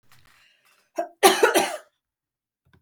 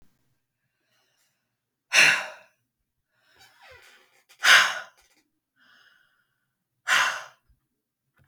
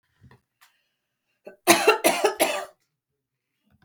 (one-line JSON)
{"cough_length": "2.8 s", "cough_amplitude": 32766, "cough_signal_mean_std_ratio": 0.31, "exhalation_length": "8.3 s", "exhalation_amplitude": 25536, "exhalation_signal_mean_std_ratio": 0.25, "three_cough_length": "3.8 s", "three_cough_amplitude": 32766, "three_cough_signal_mean_std_ratio": 0.33, "survey_phase": "beta (2021-08-13 to 2022-03-07)", "age": "45-64", "gender": "Female", "wearing_mask": "No", "symptom_sore_throat": true, "symptom_onset": "5 days", "smoker_status": "Never smoked", "respiratory_condition_asthma": false, "respiratory_condition_other": false, "recruitment_source": "REACT", "submission_delay": "2 days", "covid_test_result": "Negative", "covid_test_method": "RT-qPCR", "influenza_a_test_result": "Negative", "influenza_b_test_result": "Negative"}